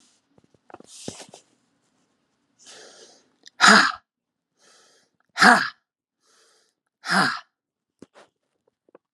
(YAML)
exhalation_length: 9.1 s
exhalation_amplitude: 32768
exhalation_signal_mean_std_ratio: 0.23
survey_phase: alpha (2021-03-01 to 2021-08-12)
age: 45-64
gender: Female
wearing_mask: 'No'
symptom_none: true
smoker_status: Ex-smoker
respiratory_condition_asthma: false
respiratory_condition_other: false
recruitment_source: REACT
submission_delay: 1 day
covid_test_result: Negative
covid_test_method: RT-qPCR